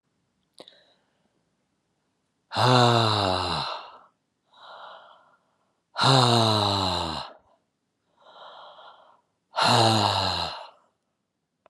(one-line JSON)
{"exhalation_length": "11.7 s", "exhalation_amplitude": 22691, "exhalation_signal_mean_std_ratio": 0.44, "survey_phase": "beta (2021-08-13 to 2022-03-07)", "age": "65+", "gender": "Male", "wearing_mask": "No", "symptom_none": true, "smoker_status": "Never smoked", "respiratory_condition_asthma": false, "respiratory_condition_other": false, "recruitment_source": "REACT", "submission_delay": "2 days", "covid_test_result": "Negative", "covid_test_method": "RT-qPCR"}